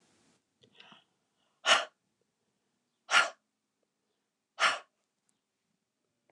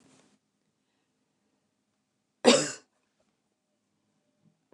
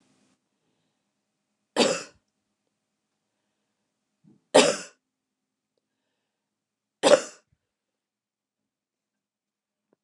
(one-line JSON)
{"exhalation_length": "6.3 s", "exhalation_amplitude": 11578, "exhalation_signal_mean_std_ratio": 0.22, "cough_length": "4.7 s", "cough_amplitude": 19044, "cough_signal_mean_std_ratio": 0.16, "three_cough_length": "10.0 s", "three_cough_amplitude": 22160, "three_cough_signal_mean_std_ratio": 0.18, "survey_phase": "beta (2021-08-13 to 2022-03-07)", "age": "45-64", "gender": "Female", "wearing_mask": "No", "symptom_cough_any": true, "symptom_runny_or_blocked_nose": true, "symptom_headache": true, "symptom_change_to_sense_of_smell_or_taste": true, "symptom_loss_of_taste": true, "symptom_onset": "5 days", "smoker_status": "Never smoked", "respiratory_condition_asthma": false, "respiratory_condition_other": false, "recruitment_source": "Test and Trace", "submission_delay": "3 days", "covid_test_result": "Positive", "covid_test_method": "RT-qPCR", "covid_ct_value": 25.5, "covid_ct_gene": "S gene", "covid_ct_mean": 25.8, "covid_viral_load": "3300 copies/ml", "covid_viral_load_category": "Minimal viral load (< 10K copies/ml)"}